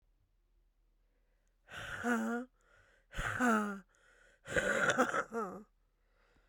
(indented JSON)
{
  "exhalation_length": "6.5 s",
  "exhalation_amplitude": 5814,
  "exhalation_signal_mean_std_ratio": 0.47,
  "survey_phase": "beta (2021-08-13 to 2022-03-07)",
  "age": "18-44",
  "gender": "Female",
  "wearing_mask": "No",
  "symptom_cough_any": true,
  "symptom_runny_or_blocked_nose": true,
  "symptom_shortness_of_breath": true,
  "symptom_onset": "6 days",
  "smoker_status": "Never smoked",
  "respiratory_condition_asthma": true,
  "respiratory_condition_other": false,
  "recruitment_source": "REACT",
  "submission_delay": "6 days",
  "covid_test_result": "Negative",
  "covid_test_method": "RT-qPCR",
  "influenza_a_test_result": "Negative",
  "influenza_b_test_result": "Negative"
}